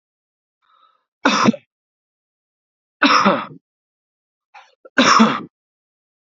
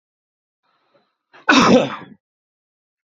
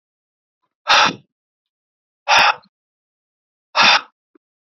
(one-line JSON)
{"three_cough_length": "6.3 s", "three_cough_amplitude": 30943, "three_cough_signal_mean_std_ratio": 0.33, "cough_length": "3.2 s", "cough_amplitude": 30783, "cough_signal_mean_std_ratio": 0.3, "exhalation_length": "4.7 s", "exhalation_amplitude": 30426, "exhalation_signal_mean_std_ratio": 0.32, "survey_phase": "beta (2021-08-13 to 2022-03-07)", "age": "18-44", "gender": "Male", "wearing_mask": "No", "symptom_none": true, "smoker_status": "Current smoker (e-cigarettes or vapes only)", "respiratory_condition_asthma": false, "respiratory_condition_other": false, "recruitment_source": "REACT", "submission_delay": "0 days", "covid_test_result": "Negative", "covid_test_method": "RT-qPCR"}